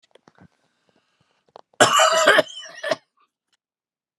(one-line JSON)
{"cough_length": "4.2 s", "cough_amplitude": 32659, "cough_signal_mean_std_ratio": 0.33, "survey_phase": "beta (2021-08-13 to 2022-03-07)", "age": "65+", "gender": "Male", "wearing_mask": "No", "symptom_runny_or_blocked_nose": true, "symptom_diarrhoea": true, "symptom_fatigue": true, "symptom_onset": "12 days", "smoker_status": "Never smoked", "respiratory_condition_asthma": false, "respiratory_condition_other": false, "recruitment_source": "REACT", "submission_delay": "2 days", "covid_test_result": "Negative", "covid_test_method": "RT-qPCR"}